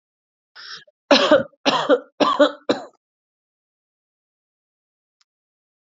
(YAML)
three_cough_length: 6.0 s
three_cough_amplitude: 32173
three_cough_signal_mean_std_ratio: 0.31
survey_phase: alpha (2021-03-01 to 2021-08-12)
age: 18-44
gender: Female
wearing_mask: 'No'
symptom_headache: true
smoker_status: Never smoked
respiratory_condition_asthma: true
respiratory_condition_other: false
recruitment_source: Test and Trace
submission_delay: 2 days
covid_test_result: Positive
covid_test_method: RT-qPCR